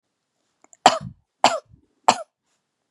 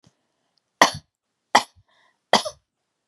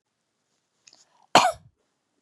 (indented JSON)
{
  "three_cough_length": "2.9 s",
  "three_cough_amplitude": 32768,
  "three_cough_signal_mean_std_ratio": 0.22,
  "exhalation_length": "3.1 s",
  "exhalation_amplitude": 32768,
  "exhalation_signal_mean_std_ratio": 0.2,
  "cough_length": "2.2 s",
  "cough_amplitude": 30145,
  "cough_signal_mean_std_ratio": 0.2,
  "survey_phase": "beta (2021-08-13 to 2022-03-07)",
  "age": "18-44",
  "gender": "Female",
  "wearing_mask": "No",
  "symptom_none": true,
  "smoker_status": "Ex-smoker",
  "respiratory_condition_asthma": false,
  "respiratory_condition_other": false,
  "recruitment_source": "REACT",
  "submission_delay": "1 day",
  "covid_test_result": "Negative",
  "covid_test_method": "RT-qPCR",
  "influenza_a_test_result": "Negative",
  "influenza_b_test_result": "Negative"
}